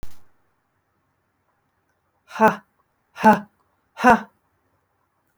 {"exhalation_length": "5.4 s", "exhalation_amplitude": 27355, "exhalation_signal_mean_std_ratio": 0.25, "survey_phase": "alpha (2021-03-01 to 2021-08-12)", "age": "65+", "gender": "Female", "wearing_mask": "No", "symptom_shortness_of_breath": true, "symptom_onset": "5 days", "smoker_status": "Ex-smoker", "respiratory_condition_asthma": false, "respiratory_condition_other": false, "recruitment_source": "REACT", "submission_delay": "1 day", "covid_test_result": "Negative", "covid_test_method": "RT-qPCR"}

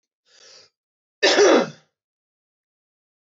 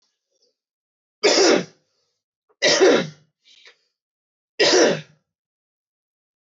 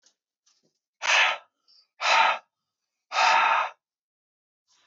{"cough_length": "3.2 s", "cough_amplitude": 19094, "cough_signal_mean_std_ratio": 0.31, "three_cough_length": "6.5 s", "three_cough_amplitude": 20337, "three_cough_signal_mean_std_ratio": 0.36, "exhalation_length": "4.9 s", "exhalation_amplitude": 13323, "exhalation_signal_mean_std_ratio": 0.42, "survey_phase": "beta (2021-08-13 to 2022-03-07)", "age": "18-44", "gender": "Male", "wearing_mask": "No", "symptom_cough_any": true, "symptom_runny_or_blocked_nose": true, "symptom_sore_throat": true, "smoker_status": "Never smoked", "respiratory_condition_asthma": false, "respiratory_condition_other": false, "recruitment_source": "Test and Trace", "submission_delay": "1 day", "covid_test_method": "RT-qPCR", "covid_ct_value": 31.7, "covid_ct_gene": "ORF1ab gene"}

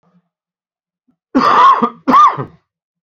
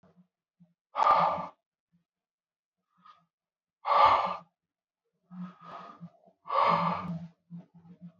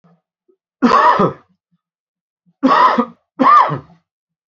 {"cough_length": "3.1 s", "cough_amplitude": 28257, "cough_signal_mean_std_ratio": 0.45, "exhalation_length": "8.2 s", "exhalation_amplitude": 11470, "exhalation_signal_mean_std_ratio": 0.37, "three_cough_length": "4.5 s", "three_cough_amplitude": 29422, "three_cough_signal_mean_std_ratio": 0.45, "survey_phase": "beta (2021-08-13 to 2022-03-07)", "age": "45-64", "gender": "Male", "wearing_mask": "No", "symptom_cough_any": true, "symptom_runny_or_blocked_nose": true, "symptom_shortness_of_breath": true, "symptom_abdominal_pain": true, "symptom_diarrhoea": true, "symptom_fatigue": true, "symptom_fever_high_temperature": true, "symptom_headache": true, "symptom_change_to_sense_of_smell_or_taste": true, "symptom_loss_of_taste": true, "symptom_onset": "4 days", "smoker_status": "Current smoker (e-cigarettes or vapes only)", "respiratory_condition_asthma": false, "respiratory_condition_other": false, "recruitment_source": "Test and Trace", "submission_delay": "1 day", "covid_test_result": "Positive", "covid_test_method": "ePCR"}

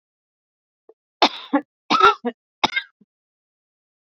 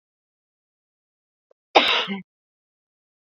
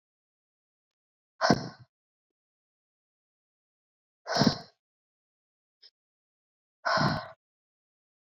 {"three_cough_length": "4.1 s", "three_cough_amplitude": 28398, "three_cough_signal_mean_std_ratio": 0.27, "cough_length": "3.3 s", "cough_amplitude": 28499, "cough_signal_mean_std_ratio": 0.23, "exhalation_length": "8.4 s", "exhalation_amplitude": 15767, "exhalation_signal_mean_std_ratio": 0.24, "survey_phase": "beta (2021-08-13 to 2022-03-07)", "age": "18-44", "gender": "Female", "wearing_mask": "No", "symptom_cough_any": true, "symptom_runny_or_blocked_nose": true, "symptom_headache": true, "symptom_onset": "12 days", "smoker_status": "Never smoked", "respiratory_condition_asthma": false, "respiratory_condition_other": false, "recruitment_source": "REACT", "submission_delay": "1 day", "covid_test_result": "Negative", "covid_test_method": "RT-qPCR"}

